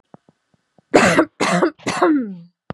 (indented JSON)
{
  "three_cough_length": "2.7 s",
  "three_cough_amplitude": 32768,
  "three_cough_signal_mean_std_ratio": 0.51,
  "survey_phase": "beta (2021-08-13 to 2022-03-07)",
  "age": "18-44",
  "gender": "Female",
  "wearing_mask": "No",
  "symptom_none": true,
  "smoker_status": "Never smoked",
  "respiratory_condition_asthma": true,
  "respiratory_condition_other": false,
  "recruitment_source": "REACT",
  "submission_delay": "1 day",
  "covid_test_result": "Negative",
  "covid_test_method": "RT-qPCR",
  "influenza_a_test_result": "Negative",
  "influenza_b_test_result": "Negative"
}